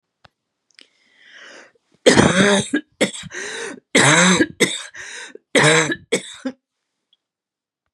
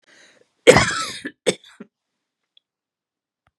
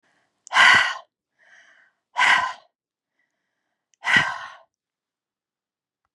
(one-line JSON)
{"three_cough_length": "7.9 s", "three_cough_amplitude": 32768, "three_cough_signal_mean_std_ratio": 0.43, "cough_length": "3.6 s", "cough_amplitude": 32768, "cough_signal_mean_std_ratio": 0.24, "exhalation_length": "6.1 s", "exhalation_amplitude": 27656, "exhalation_signal_mean_std_ratio": 0.32, "survey_phase": "beta (2021-08-13 to 2022-03-07)", "age": "65+", "gender": "Female", "wearing_mask": "No", "symptom_none": true, "smoker_status": "Never smoked", "respiratory_condition_asthma": false, "respiratory_condition_other": false, "recruitment_source": "REACT", "submission_delay": "1 day", "covid_test_result": "Negative", "covid_test_method": "RT-qPCR", "influenza_a_test_result": "Negative", "influenza_b_test_result": "Negative"}